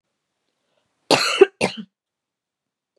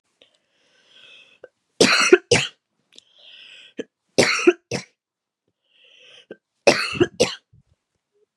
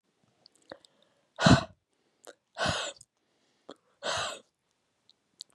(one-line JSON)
{"cough_length": "3.0 s", "cough_amplitude": 32723, "cough_signal_mean_std_ratio": 0.25, "three_cough_length": "8.4 s", "three_cough_amplitude": 32767, "three_cough_signal_mean_std_ratio": 0.29, "exhalation_length": "5.5 s", "exhalation_amplitude": 16378, "exhalation_signal_mean_std_ratio": 0.25, "survey_phase": "beta (2021-08-13 to 2022-03-07)", "age": "18-44", "gender": "Female", "wearing_mask": "No", "symptom_cough_any": true, "symptom_runny_or_blocked_nose": true, "symptom_sore_throat": true, "smoker_status": "Never smoked", "respiratory_condition_asthma": false, "respiratory_condition_other": false, "recruitment_source": "Test and Trace", "submission_delay": "2 days", "covid_test_result": "Positive", "covid_test_method": "ePCR"}